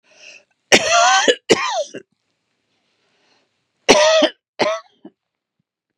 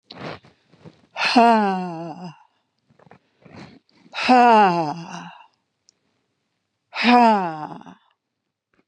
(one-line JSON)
{"cough_length": "6.0 s", "cough_amplitude": 32768, "cough_signal_mean_std_ratio": 0.4, "exhalation_length": "8.9 s", "exhalation_amplitude": 29451, "exhalation_signal_mean_std_ratio": 0.39, "survey_phase": "beta (2021-08-13 to 2022-03-07)", "age": "65+", "gender": "Female", "wearing_mask": "No", "symptom_new_continuous_cough": true, "symptom_runny_or_blocked_nose": true, "symptom_shortness_of_breath": true, "symptom_sore_throat": true, "symptom_diarrhoea": true, "symptom_fatigue": true, "symptom_fever_high_temperature": true, "symptom_headache": true, "symptom_change_to_sense_of_smell_or_taste": true, "symptom_onset": "7 days", "smoker_status": "Ex-smoker", "respiratory_condition_asthma": false, "respiratory_condition_other": false, "recruitment_source": "Test and Trace", "submission_delay": "2 days", "covid_test_result": "Positive", "covid_test_method": "ePCR"}